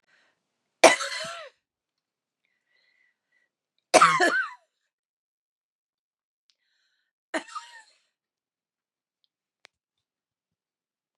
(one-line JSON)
{"three_cough_length": "11.2 s", "three_cough_amplitude": 32767, "three_cough_signal_mean_std_ratio": 0.19, "survey_phase": "beta (2021-08-13 to 2022-03-07)", "age": "45-64", "gender": "Female", "wearing_mask": "No", "symptom_cough_any": true, "symptom_sore_throat": true, "symptom_onset": "3 days", "smoker_status": "Ex-smoker", "respiratory_condition_asthma": false, "respiratory_condition_other": false, "recruitment_source": "Test and Trace", "submission_delay": "2 days", "covid_test_result": "Negative", "covid_test_method": "RT-qPCR"}